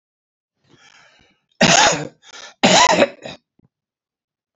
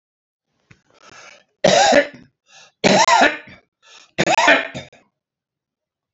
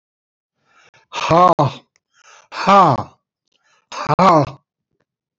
cough_length: 4.6 s
cough_amplitude: 32768
cough_signal_mean_std_ratio: 0.36
three_cough_length: 6.1 s
three_cough_amplitude: 29742
three_cough_signal_mean_std_ratio: 0.39
exhalation_length: 5.4 s
exhalation_amplitude: 28672
exhalation_signal_mean_std_ratio: 0.38
survey_phase: beta (2021-08-13 to 2022-03-07)
age: 65+
gender: Male
wearing_mask: 'No'
symptom_none: true
smoker_status: Ex-smoker
respiratory_condition_asthma: false
respiratory_condition_other: false
recruitment_source: REACT
submission_delay: 9 days
covid_test_result: Negative
covid_test_method: RT-qPCR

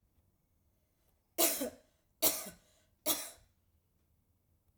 three_cough_length: 4.8 s
three_cough_amplitude: 6087
three_cough_signal_mean_std_ratio: 0.29
survey_phase: alpha (2021-03-01 to 2021-08-12)
age: 45-64
gender: Female
wearing_mask: 'No'
symptom_none: true
symptom_onset: 4 days
smoker_status: Ex-smoker
respiratory_condition_asthma: false
respiratory_condition_other: false
recruitment_source: REACT
submission_delay: 2 days
covid_test_result: Negative
covid_test_method: RT-qPCR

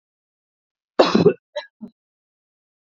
cough_length: 2.8 s
cough_amplitude: 28487
cough_signal_mean_std_ratio: 0.26
survey_phase: beta (2021-08-13 to 2022-03-07)
age: 45-64
gender: Female
wearing_mask: 'No'
symptom_runny_or_blocked_nose: true
smoker_status: Ex-smoker
respiratory_condition_asthma: true
respiratory_condition_other: false
recruitment_source: REACT
submission_delay: 1 day
covid_test_result: Negative
covid_test_method: RT-qPCR
influenza_a_test_result: Unknown/Void
influenza_b_test_result: Unknown/Void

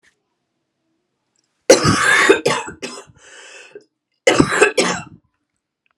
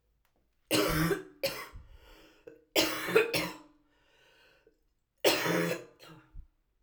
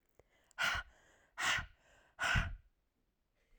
cough_length: 6.0 s
cough_amplitude: 32768
cough_signal_mean_std_ratio: 0.39
three_cough_length: 6.8 s
three_cough_amplitude: 11053
three_cough_signal_mean_std_ratio: 0.44
exhalation_length: 3.6 s
exhalation_amplitude: 3508
exhalation_signal_mean_std_ratio: 0.41
survey_phase: alpha (2021-03-01 to 2021-08-12)
age: 18-44
gender: Female
wearing_mask: 'No'
symptom_cough_any: true
symptom_fatigue: true
symptom_headache: true
symptom_onset: 5 days
smoker_status: Ex-smoker
respiratory_condition_asthma: false
respiratory_condition_other: false
recruitment_source: Test and Trace
submission_delay: 2 days
covid_test_result: Positive
covid_test_method: ePCR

